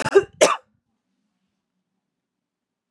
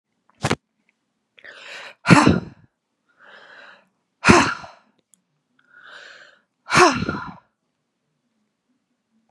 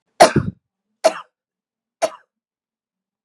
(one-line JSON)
{"cough_length": "2.9 s", "cough_amplitude": 29639, "cough_signal_mean_std_ratio": 0.23, "exhalation_length": "9.3 s", "exhalation_amplitude": 32768, "exhalation_signal_mean_std_ratio": 0.27, "three_cough_length": "3.2 s", "three_cough_amplitude": 32768, "three_cough_signal_mean_std_ratio": 0.23, "survey_phase": "beta (2021-08-13 to 2022-03-07)", "age": "18-44", "gender": "Female", "wearing_mask": "No", "symptom_cough_any": true, "symptom_new_continuous_cough": true, "symptom_runny_or_blocked_nose": true, "symptom_sore_throat": true, "symptom_abdominal_pain": true, "symptom_diarrhoea": true, "symptom_fatigue": true, "symptom_fever_high_temperature": true, "symptom_headache": true, "symptom_onset": "3 days", "smoker_status": "Ex-smoker", "respiratory_condition_asthma": false, "respiratory_condition_other": false, "recruitment_source": "Test and Trace", "submission_delay": "1 day", "covid_test_result": "Positive", "covid_test_method": "RT-qPCR", "covid_ct_value": 21.6, "covid_ct_gene": "ORF1ab gene", "covid_ct_mean": 21.8, "covid_viral_load": "71000 copies/ml", "covid_viral_load_category": "Low viral load (10K-1M copies/ml)"}